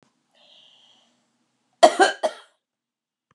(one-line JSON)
{"cough_length": "3.3 s", "cough_amplitude": 32767, "cough_signal_mean_std_ratio": 0.21, "survey_phase": "beta (2021-08-13 to 2022-03-07)", "age": "65+", "gender": "Female", "wearing_mask": "No", "symptom_none": true, "smoker_status": "Never smoked", "respiratory_condition_asthma": false, "respiratory_condition_other": false, "recruitment_source": "REACT", "submission_delay": "1 day", "covid_test_result": "Negative", "covid_test_method": "RT-qPCR", "influenza_a_test_result": "Negative", "influenza_b_test_result": "Negative"}